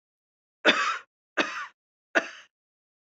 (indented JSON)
{
  "three_cough_length": "3.2 s",
  "three_cough_amplitude": 20228,
  "three_cough_signal_mean_std_ratio": 0.32,
  "survey_phase": "beta (2021-08-13 to 2022-03-07)",
  "age": "18-44",
  "gender": "Female",
  "wearing_mask": "No",
  "symptom_cough_any": true,
  "symptom_onset": "2 days",
  "smoker_status": "Never smoked",
  "respiratory_condition_asthma": false,
  "respiratory_condition_other": false,
  "recruitment_source": "REACT",
  "submission_delay": "2 days",
  "covid_test_result": "Negative",
  "covid_test_method": "RT-qPCR"
}